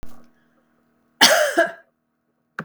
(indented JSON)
{
  "cough_length": "2.6 s",
  "cough_amplitude": 32768,
  "cough_signal_mean_std_ratio": 0.36,
  "survey_phase": "beta (2021-08-13 to 2022-03-07)",
  "age": "45-64",
  "gender": "Female",
  "wearing_mask": "No",
  "symptom_none": true,
  "smoker_status": "Ex-smoker",
  "respiratory_condition_asthma": false,
  "respiratory_condition_other": false,
  "recruitment_source": "REACT",
  "submission_delay": "1 day",
  "covid_test_result": "Negative",
  "covid_test_method": "RT-qPCR",
  "influenza_a_test_result": "Unknown/Void",
  "influenza_b_test_result": "Unknown/Void"
}